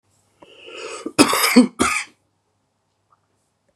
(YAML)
cough_length: 3.8 s
cough_amplitude: 32768
cough_signal_mean_std_ratio: 0.33
survey_phase: beta (2021-08-13 to 2022-03-07)
age: 45-64
gender: Male
wearing_mask: 'No'
symptom_none: true
smoker_status: Ex-smoker
respiratory_condition_asthma: false
respiratory_condition_other: false
recruitment_source: REACT
submission_delay: 2 days
covid_test_result: Negative
covid_test_method: RT-qPCR
influenza_a_test_result: Negative
influenza_b_test_result: Negative